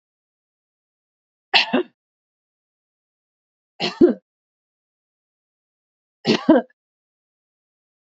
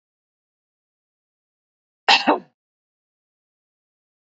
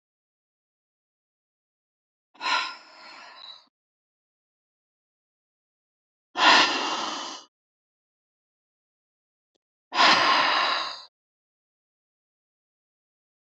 three_cough_length: 8.2 s
three_cough_amplitude: 29880
three_cough_signal_mean_std_ratio: 0.22
cough_length: 4.3 s
cough_amplitude: 29057
cough_signal_mean_std_ratio: 0.18
exhalation_length: 13.5 s
exhalation_amplitude: 21465
exhalation_signal_mean_std_ratio: 0.3
survey_phase: beta (2021-08-13 to 2022-03-07)
age: 45-64
gender: Female
wearing_mask: 'No'
symptom_none: true
smoker_status: Ex-smoker
respiratory_condition_asthma: false
respiratory_condition_other: false
recruitment_source: REACT
submission_delay: 3 days
covid_test_result: Negative
covid_test_method: RT-qPCR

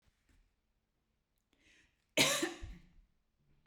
cough_length: 3.7 s
cough_amplitude: 5808
cough_signal_mean_std_ratio: 0.26
survey_phase: beta (2021-08-13 to 2022-03-07)
age: 45-64
gender: Female
wearing_mask: 'No'
symptom_none: true
smoker_status: Never smoked
respiratory_condition_asthma: false
respiratory_condition_other: false
recruitment_source: REACT
submission_delay: 1 day
covid_test_result: Negative
covid_test_method: RT-qPCR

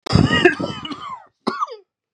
cough_length: 2.1 s
cough_amplitude: 32768
cough_signal_mean_std_ratio: 0.48
survey_phase: beta (2021-08-13 to 2022-03-07)
age: 18-44
gender: Male
wearing_mask: 'No'
symptom_cough_any: true
symptom_new_continuous_cough: true
symptom_runny_or_blocked_nose: true
symptom_shortness_of_breath: true
symptom_sore_throat: true
symptom_fatigue: true
symptom_headache: true
symptom_change_to_sense_of_smell_or_taste: true
symptom_onset: 3 days
smoker_status: Ex-smoker
respiratory_condition_asthma: false
respiratory_condition_other: false
recruitment_source: Test and Trace
submission_delay: 1 day
covid_test_result: Positive
covid_test_method: ePCR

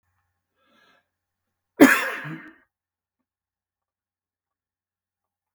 cough_length: 5.5 s
cough_amplitude: 32768
cough_signal_mean_std_ratio: 0.17
survey_phase: beta (2021-08-13 to 2022-03-07)
age: 65+
gender: Male
wearing_mask: 'No'
symptom_cough_any: true
smoker_status: Ex-smoker
respiratory_condition_asthma: true
respiratory_condition_other: false
recruitment_source: REACT
submission_delay: 2 days
covid_test_result: Negative
covid_test_method: RT-qPCR
influenza_a_test_result: Negative
influenza_b_test_result: Negative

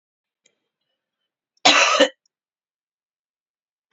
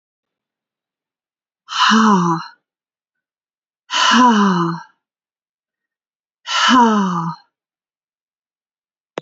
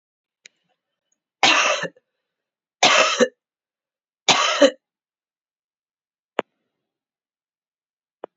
cough_length: 3.9 s
cough_amplitude: 29404
cough_signal_mean_std_ratio: 0.25
exhalation_length: 9.2 s
exhalation_amplitude: 29547
exhalation_signal_mean_std_ratio: 0.42
three_cough_length: 8.4 s
three_cough_amplitude: 32767
three_cough_signal_mean_std_ratio: 0.29
survey_phase: beta (2021-08-13 to 2022-03-07)
age: 45-64
gender: Female
wearing_mask: 'No'
symptom_cough_any: true
symptom_new_continuous_cough: true
symptom_runny_or_blocked_nose: true
symptom_shortness_of_breath: true
symptom_fatigue: true
symptom_change_to_sense_of_smell_or_taste: true
symptom_loss_of_taste: true
symptom_other: true
symptom_onset: 5 days
smoker_status: Never smoked
respiratory_condition_asthma: false
respiratory_condition_other: false
recruitment_source: Test and Trace
submission_delay: 1 day
covid_test_result: Positive
covid_test_method: RT-qPCR
covid_ct_value: 21.6
covid_ct_gene: ORF1ab gene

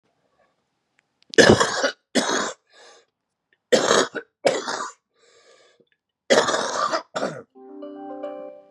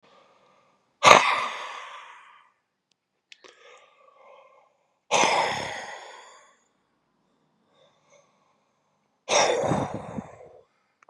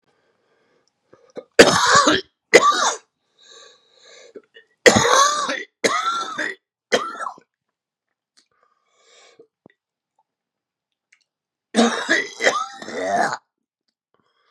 cough_length: 8.7 s
cough_amplitude: 32205
cough_signal_mean_std_ratio: 0.4
exhalation_length: 11.1 s
exhalation_amplitude: 32768
exhalation_signal_mean_std_ratio: 0.3
three_cough_length: 14.5 s
three_cough_amplitude: 32768
three_cough_signal_mean_std_ratio: 0.36
survey_phase: beta (2021-08-13 to 2022-03-07)
age: 45-64
gender: Male
wearing_mask: 'No'
symptom_cough_any: true
symptom_runny_or_blocked_nose: true
symptom_fatigue: true
symptom_onset: 12 days
smoker_status: Ex-smoker
respiratory_condition_asthma: true
respiratory_condition_other: false
recruitment_source: REACT
submission_delay: 0 days
covid_test_result: Negative
covid_test_method: RT-qPCR
influenza_a_test_result: Negative
influenza_b_test_result: Negative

